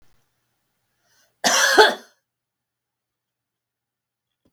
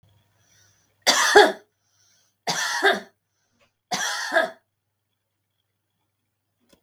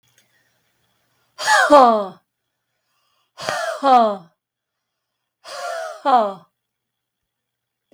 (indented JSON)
{
  "cough_length": "4.5 s",
  "cough_amplitude": 32768,
  "cough_signal_mean_std_ratio": 0.25,
  "three_cough_length": "6.8 s",
  "three_cough_amplitude": 32768,
  "three_cough_signal_mean_std_ratio": 0.31,
  "exhalation_length": "7.9 s",
  "exhalation_amplitude": 32768,
  "exhalation_signal_mean_std_ratio": 0.35,
  "survey_phase": "beta (2021-08-13 to 2022-03-07)",
  "age": "65+",
  "gender": "Female",
  "wearing_mask": "No",
  "symptom_none": true,
  "smoker_status": "Never smoked",
  "respiratory_condition_asthma": true,
  "respiratory_condition_other": false,
  "recruitment_source": "REACT",
  "submission_delay": "1 day",
  "covid_test_result": "Negative",
  "covid_test_method": "RT-qPCR"
}